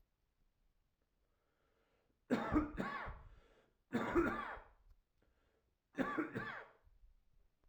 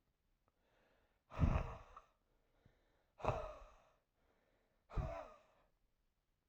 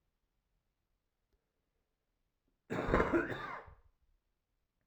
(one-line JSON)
{"three_cough_length": "7.7 s", "three_cough_amplitude": 2416, "three_cough_signal_mean_std_ratio": 0.4, "exhalation_length": "6.5 s", "exhalation_amplitude": 2780, "exhalation_signal_mean_std_ratio": 0.3, "cough_length": "4.9 s", "cough_amplitude": 6118, "cough_signal_mean_std_ratio": 0.3, "survey_phase": "alpha (2021-03-01 to 2021-08-12)", "age": "18-44", "gender": "Male", "wearing_mask": "No", "symptom_cough_any": true, "smoker_status": "Current smoker (11 or more cigarettes per day)", "respiratory_condition_asthma": false, "respiratory_condition_other": false, "recruitment_source": "Test and Trace", "submission_delay": "1 day", "covid_test_result": "Positive", "covid_test_method": "LFT"}